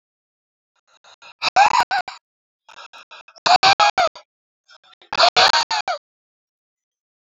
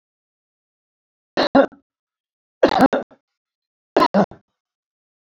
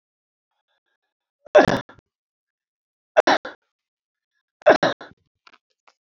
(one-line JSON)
{"exhalation_length": "7.2 s", "exhalation_amplitude": 31393, "exhalation_signal_mean_std_ratio": 0.35, "three_cough_length": "5.3 s", "three_cough_amplitude": 27530, "three_cough_signal_mean_std_ratio": 0.28, "cough_length": "6.1 s", "cough_amplitude": 28772, "cough_signal_mean_std_ratio": 0.22, "survey_phase": "beta (2021-08-13 to 2022-03-07)", "age": "65+", "gender": "Male", "wearing_mask": "No", "symptom_none": true, "smoker_status": "Never smoked", "respiratory_condition_asthma": false, "respiratory_condition_other": false, "recruitment_source": "REACT", "submission_delay": "1 day", "covid_test_result": "Negative", "covid_test_method": "RT-qPCR", "influenza_a_test_result": "Unknown/Void", "influenza_b_test_result": "Unknown/Void"}